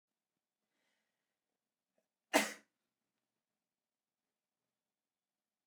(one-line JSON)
{"cough_length": "5.7 s", "cough_amplitude": 5590, "cough_signal_mean_std_ratio": 0.12, "survey_phase": "beta (2021-08-13 to 2022-03-07)", "age": "18-44", "gender": "Male", "wearing_mask": "No", "symptom_none": true, "smoker_status": "Never smoked", "respiratory_condition_asthma": false, "respiratory_condition_other": false, "recruitment_source": "REACT", "submission_delay": "3 days", "covid_test_result": "Negative", "covid_test_method": "RT-qPCR"}